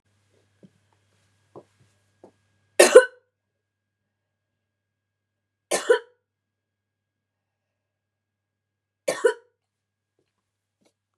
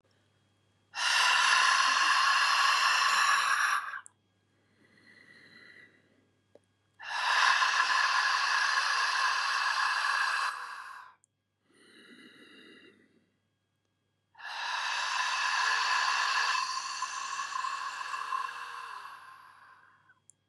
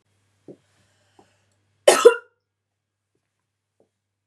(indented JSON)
{
  "three_cough_length": "11.2 s",
  "three_cough_amplitude": 32767,
  "three_cough_signal_mean_std_ratio": 0.15,
  "exhalation_length": "20.5 s",
  "exhalation_amplitude": 10826,
  "exhalation_signal_mean_std_ratio": 0.66,
  "cough_length": "4.3 s",
  "cough_amplitude": 32768,
  "cough_signal_mean_std_ratio": 0.17,
  "survey_phase": "beta (2021-08-13 to 2022-03-07)",
  "age": "45-64",
  "gender": "Female",
  "wearing_mask": "No",
  "symptom_headache": true,
  "symptom_onset": "4 days",
  "smoker_status": "Ex-smoker",
  "respiratory_condition_asthma": true,
  "respiratory_condition_other": false,
  "recruitment_source": "REACT",
  "submission_delay": "2 days",
  "covid_test_result": "Negative",
  "covid_test_method": "RT-qPCR",
  "covid_ct_value": 38.0,
  "covid_ct_gene": "N gene",
  "influenza_a_test_result": "Negative",
  "influenza_b_test_result": "Negative"
}